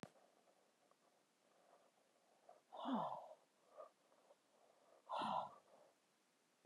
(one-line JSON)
{"exhalation_length": "6.7 s", "exhalation_amplitude": 872, "exhalation_signal_mean_std_ratio": 0.36, "survey_phase": "beta (2021-08-13 to 2022-03-07)", "age": "45-64", "gender": "Female", "wearing_mask": "No", "symptom_none": true, "smoker_status": "Never smoked", "respiratory_condition_asthma": true, "respiratory_condition_other": false, "recruitment_source": "REACT", "submission_delay": "3 days", "covid_test_result": "Negative", "covid_test_method": "RT-qPCR", "influenza_a_test_result": "Negative", "influenza_b_test_result": "Negative"}